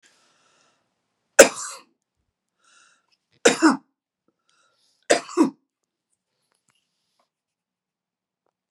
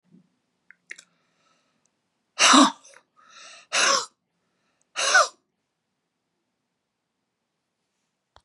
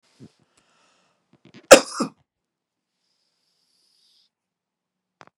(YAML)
three_cough_length: 8.7 s
three_cough_amplitude: 32768
three_cough_signal_mean_std_ratio: 0.18
exhalation_length: 8.4 s
exhalation_amplitude: 26584
exhalation_signal_mean_std_ratio: 0.25
cough_length: 5.4 s
cough_amplitude: 32768
cough_signal_mean_std_ratio: 0.12
survey_phase: beta (2021-08-13 to 2022-03-07)
age: 65+
gender: Female
wearing_mask: 'No'
symptom_cough_any: true
symptom_onset: 5 days
smoker_status: Never smoked
respiratory_condition_asthma: true
respiratory_condition_other: false
recruitment_source: REACT
submission_delay: 1 day
covid_test_result: Negative
covid_test_method: RT-qPCR
influenza_a_test_result: Negative
influenza_b_test_result: Negative